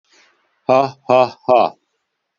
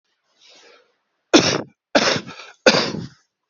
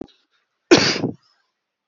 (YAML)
exhalation_length: 2.4 s
exhalation_amplitude: 28183
exhalation_signal_mean_std_ratio: 0.38
three_cough_length: 3.5 s
three_cough_amplitude: 30034
three_cough_signal_mean_std_ratio: 0.36
cough_length: 1.9 s
cough_amplitude: 30809
cough_signal_mean_std_ratio: 0.31
survey_phase: beta (2021-08-13 to 2022-03-07)
age: 45-64
gender: Male
wearing_mask: 'No'
symptom_cough_any: true
smoker_status: Current smoker (1 to 10 cigarettes per day)
respiratory_condition_asthma: false
respiratory_condition_other: false
recruitment_source: REACT
submission_delay: 1 day
covid_test_result: Negative
covid_test_method: RT-qPCR
influenza_a_test_result: Negative
influenza_b_test_result: Negative